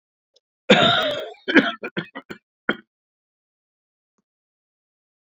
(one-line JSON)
{"three_cough_length": "5.3 s", "three_cough_amplitude": 32767, "three_cough_signal_mean_std_ratio": 0.3, "survey_phase": "beta (2021-08-13 to 2022-03-07)", "age": "45-64", "gender": "Male", "wearing_mask": "No", "symptom_fatigue": true, "symptom_headache": true, "symptom_onset": "3 days", "smoker_status": "Never smoked", "respiratory_condition_asthma": false, "respiratory_condition_other": false, "recruitment_source": "Test and Trace", "submission_delay": "2 days", "covid_test_result": "Positive", "covid_test_method": "LAMP"}